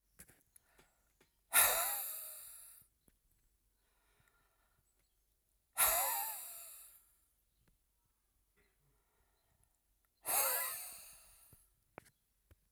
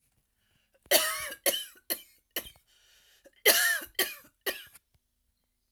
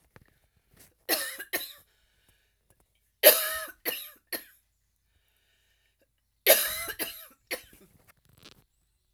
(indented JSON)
{
  "exhalation_length": "12.7 s",
  "exhalation_amplitude": 5736,
  "exhalation_signal_mean_std_ratio": 0.31,
  "cough_length": "5.7 s",
  "cough_amplitude": 15890,
  "cough_signal_mean_std_ratio": 0.34,
  "three_cough_length": "9.1 s",
  "three_cough_amplitude": 32767,
  "three_cough_signal_mean_std_ratio": 0.25,
  "survey_phase": "alpha (2021-03-01 to 2021-08-12)",
  "age": "45-64",
  "gender": "Female",
  "wearing_mask": "No",
  "symptom_none": true,
  "smoker_status": "Ex-smoker",
  "respiratory_condition_asthma": false,
  "respiratory_condition_other": false,
  "recruitment_source": "REACT",
  "submission_delay": "1 day",
  "covid_test_result": "Negative",
  "covid_test_method": "RT-qPCR"
}